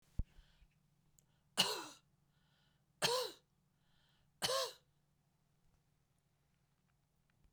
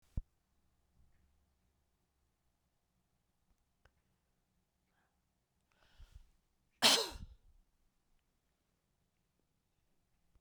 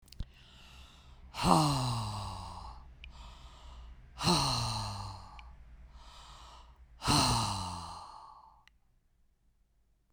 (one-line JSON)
{"three_cough_length": "7.5 s", "three_cough_amplitude": 4682, "three_cough_signal_mean_std_ratio": 0.27, "cough_length": "10.4 s", "cough_amplitude": 6828, "cough_signal_mean_std_ratio": 0.15, "exhalation_length": "10.1 s", "exhalation_amplitude": 11104, "exhalation_signal_mean_std_ratio": 0.48, "survey_phase": "beta (2021-08-13 to 2022-03-07)", "age": "65+", "gender": "Female", "wearing_mask": "No", "symptom_runny_or_blocked_nose": true, "symptom_fatigue": true, "symptom_headache": true, "symptom_other": true, "smoker_status": "Never smoked", "respiratory_condition_asthma": false, "respiratory_condition_other": false, "recruitment_source": "Test and Trace", "submission_delay": "2 days", "covid_test_result": "Positive", "covid_test_method": "RT-qPCR", "covid_ct_value": 19.7, "covid_ct_gene": "ORF1ab gene"}